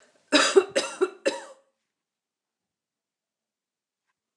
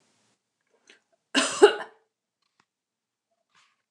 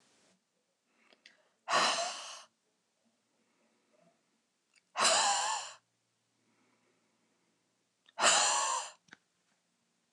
{"three_cough_length": "4.4 s", "three_cough_amplitude": 19260, "three_cough_signal_mean_std_ratio": 0.27, "cough_length": "3.9 s", "cough_amplitude": 26272, "cough_signal_mean_std_ratio": 0.19, "exhalation_length": "10.1 s", "exhalation_amplitude": 8527, "exhalation_signal_mean_std_ratio": 0.35, "survey_phase": "beta (2021-08-13 to 2022-03-07)", "age": "45-64", "gender": "Female", "wearing_mask": "No", "symptom_none": true, "smoker_status": "Ex-smoker", "respiratory_condition_asthma": false, "respiratory_condition_other": false, "recruitment_source": "REACT", "submission_delay": "2 days", "covid_test_result": "Negative", "covid_test_method": "RT-qPCR", "influenza_a_test_result": "Negative", "influenza_b_test_result": "Negative"}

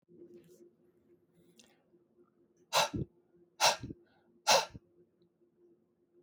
{"exhalation_length": "6.2 s", "exhalation_amplitude": 9169, "exhalation_signal_mean_std_ratio": 0.26, "survey_phase": "alpha (2021-03-01 to 2021-08-12)", "age": "45-64", "gender": "Male", "wearing_mask": "No", "symptom_none": true, "smoker_status": "Never smoked", "respiratory_condition_asthma": false, "respiratory_condition_other": false, "recruitment_source": "REACT", "submission_delay": "1 day", "covid_test_result": "Negative", "covid_test_method": "RT-qPCR"}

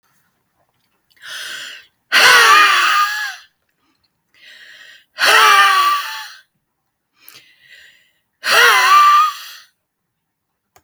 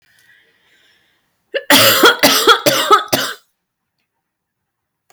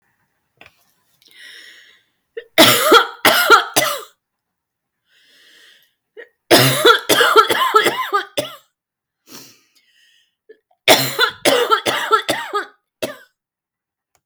{"exhalation_length": "10.8 s", "exhalation_amplitude": 32768, "exhalation_signal_mean_std_ratio": 0.46, "cough_length": "5.1 s", "cough_amplitude": 32768, "cough_signal_mean_std_ratio": 0.42, "three_cough_length": "14.3 s", "three_cough_amplitude": 32768, "three_cough_signal_mean_std_ratio": 0.41, "survey_phase": "beta (2021-08-13 to 2022-03-07)", "age": "45-64", "gender": "Female", "wearing_mask": "No", "symptom_runny_or_blocked_nose": true, "symptom_fatigue": true, "symptom_headache": true, "symptom_change_to_sense_of_smell_or_taste": true, "smoker_status": "Ex-smoker", "respiratory_condition_asthma": false, "respiratory_condition_other": false, "recruitment_source": "REACT", "submission_delay": "14 days", "covid_test_result": "Negative", "covid_test_method": "RT-qPCR", "influenza_a_test_result": "Negative", "influenza_b_test_result": "Negative"}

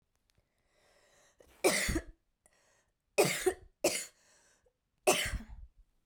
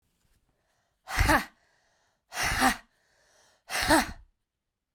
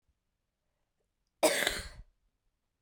{"three_cough_length": "6.1 s", "three_cough_amplitude": 7392, "three_cough_signal_mean_std_ratio": 0.34, "exhalation_length": "4.9 s", "exhalation_amplitude": 12396, "exhalation_signal_mean_std_ratio": 0.37, "cough_length": "2.8 s", "cough_amplitude": 10537, "cough_signal_mean_std_ratio": 0.27, "survey_phase": "beta (2021-08-13 to 2022-03-07)", "age": "18-44", "gender": "Female", "wearing_mask": "No", "symptom_cough_any": true, "symptom_runny_or_blocked_nose": true, "symptom_sore_throat": true, "symptom_diarrhoea": true, "symptom_fatigue": true, "symptom_change_to_sense_of_smell_or_taste": true, "symptom_loss_of_taste": true, "symptom_onset": "6 days", "smoker_status": "Never smoked", "respiratory_condition_asthma": false, "respiratory_condition_other": false, "recruitment_source": "Test and Trace", "submission_delay": "2 days", "covid_test_result": "Positive", "covid_test_method": "RT-qPCR"}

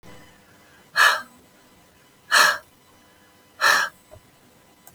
{"exhalation_length": "4.9 s", "exhalation_amplitude": 24435, "exhalation_signal_mean_std_ratio": 0.33, "survey_phase": "beta (2021-08-13 to 2022-03-07)", "age": "45-64", "gender": "Female", "wearing_mask": "No", "symptom_none": true, "smoker_status": "Current smoker (e-cigarettes or vapes only)", "respiratory_condition_asthma": false, "respiratory_condition_other": false, "recruitment_source": "REACT", "submission_delay": "2 days", "covid_test_result": "Negative", "covid_test_method": "RT-qPCR", "influenza_a_test_result": "Negative", "influenza_b_test_result": "Negative"}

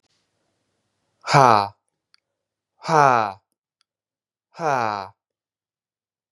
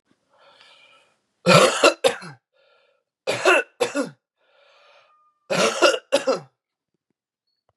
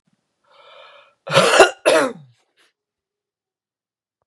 {"exhalation_length": "6.3 s", "exhalation_amplitude": 32767, "exhalation_signal_mean_std_ratio": 0.27, "three_cough_length": "7.8 s", "three_cough_amplitude": 31837, "three_cough_signal_mean_std_ratio": 0.35, "cough_length": "4.3 s", "cough_amplitude": 32768, "cough_signal_mean_std_ratio": 0.3, "survey_phase": "beta (2021-08-13 to 2022-03-07)", "age": "18-44", "gender": "Male", "wearing_mask": "No", "symptom_cough_any": true, "symptom_runny_or_blocked_nose": true, "symptom_sore_throat": true, "symptom_fatigue": true, "symptom_onset": "4 days", "smoker_status": "Never smoked", "respiratory_condition_asthma": false, "respiratory_condition_other": false, "recruitment_source": "Test and Trace", "submission_delay": "2 days", "covid_test_result": "Positive", "covid_test_method": "RT-qPCR", "covid_ct_value": 20.1, "covid_ct_gene": "ORF1ab gene", "covid_ct_mean": 20.3, "covid_viral_load": "230000 copies/ml", "covid_viral_load_category": "Low viral load (10K-1M copies/ml)"}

